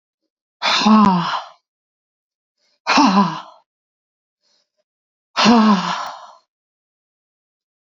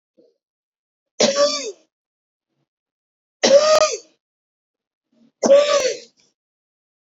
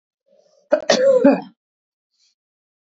{"exhalation_length": "7.9 s", "exhalation_amplitude": 28077, "exhalation_signal_mean_std_ratio": 0.4, "three_cough_length": "7.1 s", "three_cough_amplitude": 27454, "three_cough_signal_mean_std_ratio": 0.36, "cough_length": "2.9 s", "cough_amplitude": 26917, "cough_signal_mean_std_ratio": 0.36, "survey_phase": "beta (2021-08-13 to 2022-03-07)", "age": "45-64", "gender": "Female", "wearing_mask": "No", "symptom_cough_any": true, "symptom_runny_or_blocked_nose": true, "symptom_shortness_of_breath": true, "symptom_fatigue": true, "symptom_onset": "4 days", "smoker_status": "Never smoked", "respiratory_condition_asthma": true, "respiratory_condition_other": false, "recruitment_source": "Test and Trace", "submission_delay": "2 days", "covid_test_result": "Positive", "covid_test_method": "ePCR"}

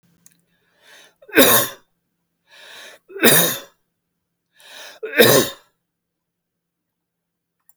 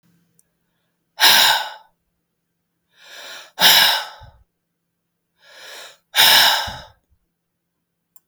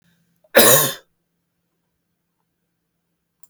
{"three_cough_length": "7.8 s", "three_cough_amplitude": 32768, "three_cough_signal_mean_std_ratio": 0.3, "exhalation_length": "8.3 s", "exhalation_amplitude": 32768, "exhalation_signal_mean_std_ratio": 0.34, "cough_length": "3.5 s", "cough_amplitude": 32768, "cough_signal_mean_std_ratio": 0.25, "survey_phase": "beta (2021-08-13 to 2022-03-07)", "age": "65+", "gender": "Male", "wearing_mask": "No", "symptom_none": true, "smoker_status": "Never smoked", "respiratory_condition_asthma": false, "respiratory_condition_other": false, "recruitment_source": "REACT", "submission_delay": "2 days", "covid_test_result": "Negative", "covid_test_method": "RT-qPCR", "influenza_a_test_result": "Negative", "influenza_b_test_result": "Negative"}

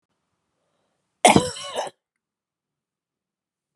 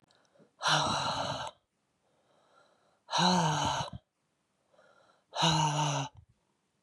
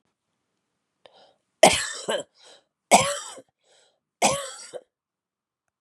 {"cough_length": "3.8 s", "cough_amplitude": 32768, "cough_signal_mean_std_ratio": 0.21, "exhalation_length": "6.8 s", "exhalation_amplitude": 7810, "exhalation_signal_mean_std_ratio": 0.5, "three_cough_length": "5.8 s", "three_cough_amplitude": 31599, "three_cough_signal_mean_std_ratio": 0.27, "survey_phase": "beta (2021-08-13 to 2022-03-07)", "age": "45-64", "gender": "Female", "wearing_mask": "No", "symptom_cough_any": true, "symptom_sore_throat": true, "symptom_diarrhoea": true, "symptom_fatigue": true, "symptom_headache": true, "symptom_other": true, "symptom_onset": "5 days", "smoker_status": "Ex-smoker", "respiratory_condition_asthma": false, "respiratory_condition_other": false, "recruitment_source": "Test and Trace", "submission_delay": "1 day", "covid_test_result": "Positive", "covid_test_method": "RT-qPCR", "covid_ct_value": 19.6, "covid_ct_gene": "N gene"}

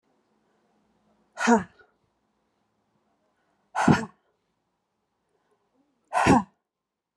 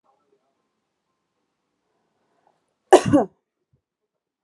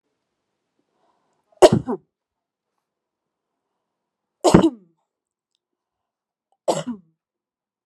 {"exhalation_length": "7.2 s", "exhalation_amplitude": 22134, "exhalation_signal_mean_std_ratio": 0.25, "cough_length": "4.4 s", "cough_amplitude": 32673, "cough_signal_mean_std_ratio": 0.17, "three_cough_length": "7.9 s", "three_cough_amplitude": 32768, "three_cough_signal_mean_std_ratio": 0.19, "survey_phase": "alpha (2021-03-01 to 2021-08-12)", "age": "45-64", "gender": "Female", "wearing_mask": "No", "symptom_none": true, "smoker_status": "Never smoked", "respiratory_condition_asthma": false, "respiratory_condition_other": false, "recruitment_source": "REACT", "submission_delay": "2 days", "covid_test_result": "Negative", "covid_test_method": "RT-qPCR"}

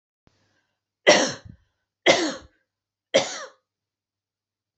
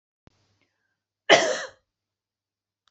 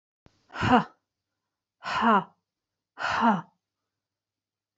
{"three_cough_length": "4.8 s", "three_cough_amplitude": 27416, "three_cough_signal_mean_std_ratio": 0.28, "cough_length": "2.9 s", "cough_amplitude": 27742, "cough_signal_mean_std_ratio": 0.22, "exhalation_length": "4.8 s", "exhalation_amplitude": 16354, "exhalation_signal_mean_std_ratio": 0.35, "survey_phase": "beta (2021-08-13 to 2022-03-07)", "age": "45-64", "gender": "Female", "wearing_mask": "No", "symptom_runny_or_blocked_nose": true, "symptom_sore_throat": true, "symptom_fatigue": true, "symptom_onset": "5 days", "smoker_status": "Never smoked", "respiratory_condition_asthma": false, "respiratory_condition_other": false, "recruitment_source": "Test and Trace", "submission_delay": "3 days", "covid_test_result": "Negative", "covid_test_method": "RT-qPCR"}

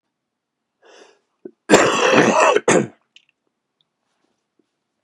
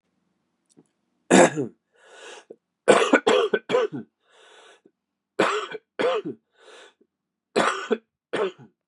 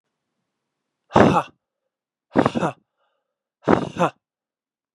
{"cough_length": "5.0 s", "cough_amplitude": 32768, "cough_signal_mean_std_ratio": 0.37, "three_cough_length": "8.9 s", "three_cough_amplitude": 29317, "three_cough_signal_mean_std_ratio": 0.37, "exhalation_length": "4.9 s", "exhalation_amplitude": 32767, "exhalation_signal_mean_std_ratio": 0.29, "survey_phase": "beta (2021-08-13 to 2022-03-07)", "age": "45-64", "gender": "Male", "wearing_mask": "No", "symptom_cough_any": true, "symptom_runny_or_blocked_nose": true, "symptom_onset": "4 days", "smoker_status": "Ex-smoker", "respiratory_condition_asthma": false, "respiratory_condition_other": false, "recruitment_source": "Test and Trace", "submission_delay": "1 day", "covid_test_result": "Positive", "covid_test_method": "RT-qPCR"}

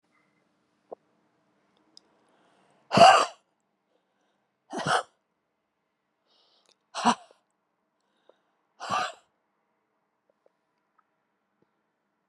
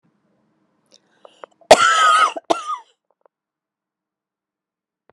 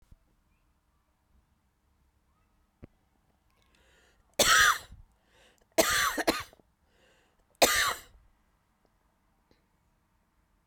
{"exhalation_length": "12.3 s", "exhalation_amplitude": 25532, "exhalation_signal_mean_std_ratio": 0.19, "cough_length": "5.1 s", "cough_amplitude": 32768, "cough_signal_mean_std_ratio": 0.29, "three_cough_length": "10.7 s", "three_cough_amplitude": 13063, "three_cough_signal_mean_std_ratio": 0.27, "survey_phase": "beta (2021-08-13 to 2022-03-07)", "age": "45-64", "gender": "Female", "wearing_mask": "No", "symptom_cough_any": true, "symptom_runny_or_blocked_nose": true, "symptom_fatigue": true, "symptom_headache": true, "smoker_status": "Never smoked", "respiratory_condition_asthma": true, "respiratory_condition_other": true, "recruitment_source": "Test and Trace", "submission_delay": "2 days", "covid_test_result": "Positive", "covid_test_method": "RT-qPCR"}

